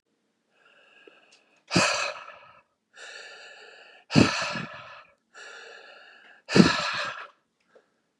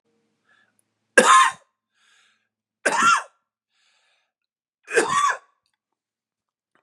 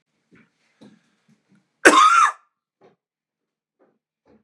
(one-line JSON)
{"exhalation_length": "8.2 s", "exhalation_amplitude": 29004, "exhalation_signal_mean_std_ratio": 0.32, "three_cough_length": "6.8 s", "three_cough_amplitude": 32744, "three_cough_signal_mean_std_ratio": 0.31, "cough_length": "4.4 s", "cough_amplitude": 32768, "cough_signal_mean_std_ratio": 0.27, "survey_phase": "beta (2021-08-13 to 2022-03-07)", "age": "18-44", "gender": "Male", "wearing_mask": "No", "symptom_cough_any": true, "symptom_new_continuous_cough": true, "symptom_runny_or_blocked_nose": true, "symptom_shortness_of_breath": true, "symptom_abdominal_pain": true, "symptom_fatigue": true, "symptom_headache": true, "symptom_onset": "5 days", "smoker_status": "Ex-smoker", "respiratory_condition_asthma": false, "respiratory_condition_other": false, "recruitment_source": "Test and Trace", "submission_delay": "2 days", "covid_test_result": "Positive", "covid_test_method": "RT-qPCR", "covid_ct_value": 23.1, "covid_ct_gene": "ORF1ab gene"}